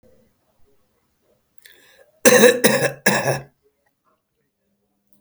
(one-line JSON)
{"cough_length": "5.2 s", "cough_amplitude": 32767, "cough_signal_mean_std_ratio": 0.31, "survey_phase": "alpha (2021-03-01 to 2021-08-12)", "age": "45-64", "gender": "Male", "wearing_mask": "No", "symptom_none": true, "smoker_status": "Current smoker (11 or more cigarettes per day)", "respiratory_condition_asthma": false, "respiratory_condition_other": false, "recruitment_source": "REACT", "submission_delay": "2 days", "covid_test_result": "Negative", "covid_test_method": "RT-qPCR"}